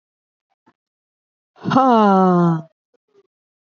{
  "exhalation_length": "3.8 s",
  "exhalation_amplitude": 27358,
  "exhalation_signal_mean_std_ratio": 0.42,
  "survey_phase": "alpha (2021-03-01 to 2021-08-12)",
  "age": "18-44",
  "gender": "Female",
  "wearing_mask": "No",
  "symptom_cough_any": true,
  "symptom_headache": true,
  "symptom_change_to_sense_of_smell_or_taste": true,
  "symptom_onset": "4 days",
  "smoker_status": "Never smoked",
  "respiratory_condition_asthma": false,
  "respiratory_condition_other": false,
  "recruitment_source": "Test and Trace",
  "submission_delay": "2 days",
  "covid_test_result": "Positive",
  "covid_test_method": "RT-qPCR",
  "covid_ct_value": 13.9,
  "covid_ct_gene": "ORF1ab gene",
  "covid_ct_mean": 14.5,
  "covid_viral_load": "18000000 copies/ml",
  "covid_viral_load_category": "High viral load (>1M copies/ml)"
}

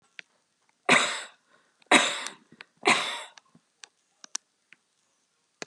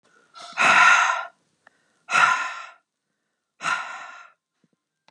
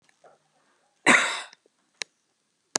{
  "three_cough_length": "5.7 s",
  "three_cough_amplitude": 23911,
  "three_cough_signal_mean_std_ratio": 0.29,
  "exhalation_length": "5.1 s",
  "exhalation_amplitude": 23684,
  "exhalation_signal_mean_std_ratio": 0.4,
  "cough_length": "2.8 s",
  "cough_amplitude": 27333,
  "cough_signal_mean_std_ratio": 0.25,
  "survey_phase": "beta (2021-08-13 to 2022-03-07)",
  "age": "45-64",
  "gender": "Female",
  "wearing_mask": "No",
  "symptom_fatigue": true,
  "symptom_headache": true,
  "smoker_status": "Never smoked",
  "respiratory_condition_asthma": true,
  "respiratory_condition_other": false,
  "recruitment_source": "REACT",
  "submission_delay": "1 day",
  "covid_test_result": "Negative",
  "covid_test_method": "RT-qPCR",
  "influenza_a_test_result": "Unknown/Void",
  "influenza_b_test_result": "Unknown/Void"
}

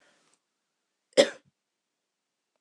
{
  "cough_length": "2.6 s",
  "cough_amplitude": 21129,
  "cough_signal_mean_std_ratio": 0.14,
  "survey_phase": "beta (2021-08-13 to 2022-03-07)",
  "age": "65+",
  "gender": "Female",
  "wearing_mask": "No",
  "symptom_none": true,
  "smoker_status": "Never smoked",
  "respiratory_condition_asthma": false,
  "respiratory_condition_other": false,
  "recruitment_source": "REACT",
  "submission_delay": "1 day",
  "covid_test_result": "Negative",
  "covid_test_method": "RT-qPCR"
}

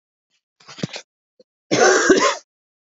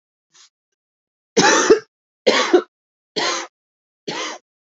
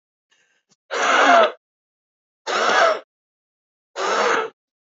{
  "cough_length": "2.9 s",
  "cough_amplitude": 27067,
  "cough_signal_mean_std_ratio": 0.4,
  "three_cough_length": "4.7 s",
  "three_cough_amplitude": 27954,
  "three_cough_signal_mean_std_ratio": 0.37,
  "exhalation_length": "4.9 s",
  "exhalation_amplitude": 26162,
  "exhalation_signal_mean_std_ratio": 0.46,
  "survey_phase": "alpha (2021-03-01 to 2021-08-12)",
  "age": "18-44",
  "gender": "Female",
  "wearing_mask": "No",
  "symptom_fatigue": true,
  "symptom_change_to_sense_of_smell_or_taste": true,
  "smoker_status": "Current smoker (1 to 10 cigarettes per day)",
  "respiratory_condition_asthma": false,
  "respiratory_condition_other": false,
  "recruitment_source": "Test and Trace",
  "submission_delay": "2 days",
  "covid_test_result": "Positive",
  "covid_test_method": "RT-qPCR",
  "covid_ct_value": 26.7,
  "covid_ct_gene": "ORF1ab gene",
  "covid_ct_mean": 27.3,
  "covid_viral_load": "1100 copies/ml",
  "covid_viral_load_category": "Minimal viral load (< 10K copies/ml)"
}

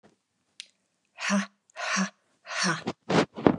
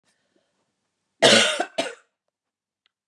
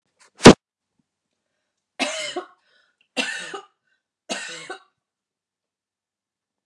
{
  "exhalation_length": "3.6 s",
  "exhalation_amplitude": 25015,
  "exhalation_signal_mean_std_ratio": 0.42,
  "cough_length": "3.1 s",
  "cough_amplitude": 29006,
  "cough_signal_mean_std_ratio": 0.3,
  "three_cough_length": "6.7 s",
  "three_cough_amplitude": 32768,
  "three_cough_signal_mean_std_ratio": 0.16,
  "survey_phase": "beta (2021-08-13 to 2022-03-07)",
  "age": "45-64",
  "gender": "Female",
  "wearing_mask": "No",
  "symptom_none": true,
  "smoker_status": "Ex-smoker",
  "respiratory_condition_asthma": false,
  "respiratory_condition_other": false,
  "recruitment_source": "REACT",
  "submission_delay": "5 days",
  "covid_test_result": "Negative",
  "covid_test_method": "RT-qPCR",
  "influenza_a_test_result": "Negative",
  "influenza_b_test_result": "Negative"
}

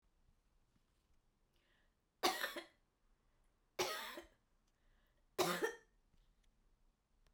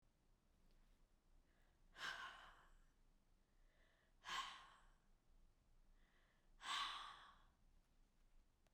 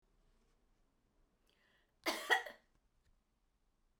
{
  "three_cough_length": "7.3 s",
  "three_cough_amplitude": 3092,
  "three_cough_signal_mean_std_ratio": 0.3,
  "exhalation_length": "8.7 s",
  "exhalation_amplitude": 656,
  "exhalation_signal_mean_std_ratio": 0.43,
  "cough_length": "4.0 s",
  "cough_amplitude": 4425,
  "cough_signal_mean_std_ratio": 0.22,
  "survey_phase": "beta (2021-08-13 to 2022-03-07)",
  "age": "45-64",
  "gender": "Female",
  "wearing_mask": "No",
  "symptom_none": true,
  "smoker_status": "Never smoked",
  "respiratory_condition_asthma": false,
  "respiratory_condition_other": false,
  "recruitment_source": "REACT",
  "submission_delay": "2 days",
  "covid_test_result": "Negative",
  "covid_test_method": "RT-qPCR"
}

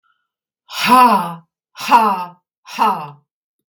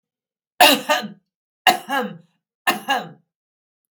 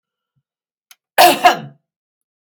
{
  "exhalation_length": "3.7 s",
  "exhalation_amplitude": 32768,
  "exhalation_signal_mean_std_ratio": 0.45,
  "three_cough_length": "4.0 s",
  "three_cough_amplitude": 32767,
  "three_cough_signal_mean_std_ratio": 0.34,
  "cough_length": "2.4 s",
  "cough_amplitude": 32768,
  "cough_signal_mean_std_ratio": 0.29,
  "survey_phase": "beta (2021-08-13 to 2022-03-07)",
  "age": "45-64",
  "gender": "Female",
  "wearing_mask": "No",
  "symptom_fatigue": true,
  "symptom_change_to_sense_of_smell_or_taste": true,
  "smoker_status": "Ex-smoker",
  "respiratory_condition_asthma": false,
  "respiratory_condition_other": false,
  "recruitment_source": "REACT",
  "submission_delay": "2 days",
  "covid_test_result": "Negative",
  "covid_test_method": "RT-qPCR",
  "influenza_a_test_result": "Negative",
  "influenza_b_test_result": "Negative"
}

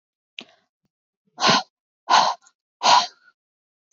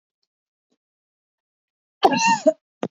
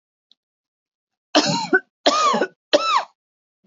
{
  "exhalation_length": "3.9 s",
  "exhalation_amplitude": 25515,
  "exhalation_signal_mean_std_ratio": 0.33,
  "cough_length": "2.9 s",
  "cough_amplitude": 26379,
  "cough_signal_mean_std_ratio": 0.29,
  "three_cough_length": "3.7 s",
  "three_cough_amplitude": 27249,
  "three_cough_signal_mean_std_ratio": 0.43,
  "survey_phase": "beta (2021-08-13 to 2022-03-07)",
  "age": "18-44",
  "gender": "Female",
  "wearing_mask": "No",
  "symptom_none": true,
  "smoker_status": "Never smoked",
  "respiratory_condition_asthma": false,
  "respiratory_condition_other": false,
  "recruitment_source": "REACT",
  "submission_delay": "1 day",
  "covid_test_result": "Negative",
  "covid_test_method": "RT-qPCR",
  "influenza_a_test_result": "Negative",
  "influenza_b_test_result": "Negative"
}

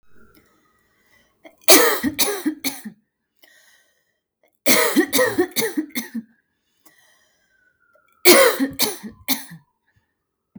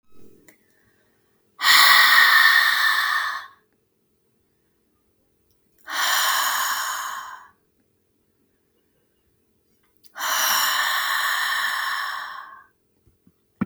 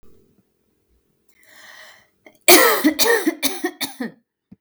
{
  "three_cough_length": "10.6 s",
  "three_cough_amplitude": 32768,
  "three_cough_signal_mean_std_ratio": 0.36,
  "exhalation_length": "13.7 s",
  "exhalation_amplitude": 31530,
  "exhalation_signal_mean_std_ratio": 0.49,
  "cough_length": "4.6 s",
  "cough_amplitude": 32768,
  "cough_signal_mean_std_ratio": 0.37,
  "survey_phase": "beta (2021-08-13 to 2022-03-07)",
  "age": "18-44",
  "gender": "Female",
  "wearing_mask": "No",
  "symptom_none": true,
  "symptom_onset": "8 days",
  "smoker_status": "Ex-smoker",
  "respiratory_condition_asthma": true,
  "respiratory_condition_other": false,
  "recruitment_source": "REACT",
  "submission_delay": "2 days",
  "covid_test_result": "Negative",
  "covid_test_method": "RT-qPCR",
  "influenza_a_test_result": "Negative",
  "influenza_b_test_result": "Negative"
}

